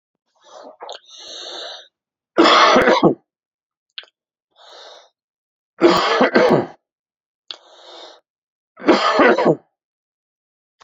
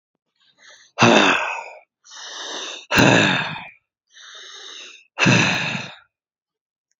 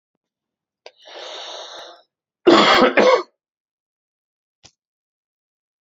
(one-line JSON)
{"three_cough_length": "10.8 s", "three_cough_amplitude": 32742, "three_cough_signal_mean_std_ratio": 0.39, "exhalation_length": "7.0 s", "exhalation_amplitude": 32767, "exhalation_signal_mean_std_ratio": 0.44, "cough_length": "5.8 s", "cough_amplitude": 32768, "cough_signal_mean_std_ratio": 0.31, "survey_phase": "beta (2021-08-13 to 2022-03-07)", "age": "45-64", "gender": "Male", "wearing_mask": "No", "symptom_cough_any": true, "symptom_runny_or_blocked_nose": true, "symptom_sore_throat": true, "symptom_fatigue": true, "symptom_fever_high_temperature": true, "symptom_onset": "2 days", "smoker_status": "Never smoked", "respiratory_condition_asthma": false, "respiratory_condition_other": false, "recruitment_source": "Test and Trace", "submission_delay": "2 days", "covid_test_result": "Positive", "covid_test_method": "RT-qPCR"}